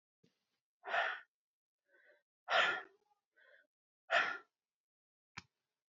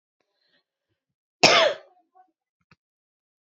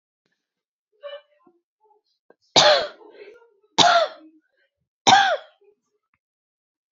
{
  "exhalation_length": "5.9 s",
  "exhalation_amplitude": 3963,
  "exhalation_signal_mean_std_ratio": 0.3,
  "cough_length": "3.4 s",
  "cough_amplitude": 28709,
  "cough_signal_mean_std_ratio": 0.23,
  "three_cough_length": "6.9 s",
  "three_cough_amplitude": 32767,
  "three_cough_signal_mean_std_ratio": 0.3,
  "survey_phase": "beta (2021-08-13 to 2022-03-07)",
  "age": "18-44",
  "gender": "Female",
  "wearing_mask": "No",
  "symptom_sore_throat": true,
  "symptom_onset": "11 days",
  "smoker_status": "Ex-smoker",
  "respiratory_condition_asthma": false,
  "respiratory_condition_other": false,
  "recruitment_source": "REACT",
  "submission_delay": "1 day",
  "covid_test_result": "Negative",
  "covid_test_method": "RT-qPCR",
  "influenza_a_test_result": "Negative",
  "influenza_b_test_result": "Negative"
}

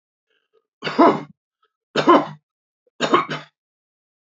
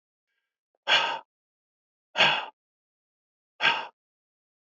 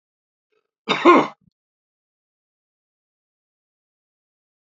{
  "three_cough_length": "4.4 s",
  "three_cough_amplitude": 27512,
  "three_cough_signal_mean_std_ratio": 0.32,
  "exhalation_length": "4.8 s",
  "exhalation_amplitude": 14523,
  "exhalation_signal_mean_std_ratio": 0.3,
  "cough_length": "4.6 s",
  "cough_amplitude": 28167,
  "cough_signal_mean_std_ratio": 0.19,
  "survey_phase": "alpha (2021-03-01 to 2021-08-12)",
  "age": "18-44",
  "gender": "Male",
  "wearing_mask": "No",
  "symptom_none": true,
  "smoker_status": "Never smoked",
  "respiratory_condition_asthma": false,
  "respiratory_condition_other": false,
  "recruitment_source": "REACT",
  "submission_delay": "1 day",
  "covid_test_result": "Negative",
  "covid_test_method": "RT-qPCR"
}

